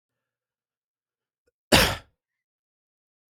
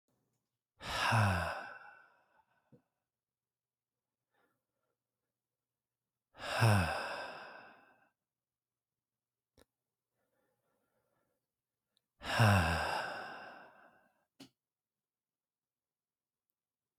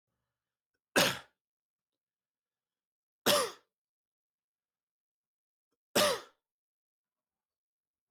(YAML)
cough_length: 3.3 s
cough_amplitude: 32350
cough_signal_mean_std_ratio: 0.19
exhalation_length: 17.0 s
exhalation_amplitude: 5214
exhalation_signal_mean_std_ratio: 0.3
three_cough_length: 8.1 s
three_cough_amplitude: 10107
three_cough_signal_mean_std_ratio: 0.22
survey_phase: beta (2021-08-13 to 2022-03-07)
age: 18-44
gender: Male
wearing_mask: 'No'
symptom_cough_any: true
symptom_new_continuous_cough: true
symptom_runny_or_blocked_nose: true
symptom_fever_high_temperature: true
symptom_change_to_sense_of_smell_or_taste: true
symptom_loss_of_taste: true
smoker_status: Never smoked
respiratory_condition_asthma: false
respiratory_condition_other: false
recruitment_source: Test and Trace
submission_delay: 1 day
covid_test_result: Positive
covid_test_method: RT-qPCR